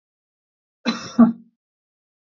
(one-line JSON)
{"cough_length": "2.4 s", "cough_amplitude": 26472, "cough_signal_mean_std_ratio": 0.24, "survey_phase": "beta (2021-08-13 to 2022-03-07)", "age": "45-64", "gender": "Male", "wearing_mask": "No", "symptom_none": true, "smoker_status": "Never smoked", "respiratory_condition_asthma": false, "respiratory_condition_other": false, "recruitment_source": "REACT", "submission_delay": "5 days", "covid_test_result": "Negative", "covid_test_method": "RT-qPCR", "influenza_a_test_result": "Unknown/Void", "influenza_b_test_result": "Unknown/Void"}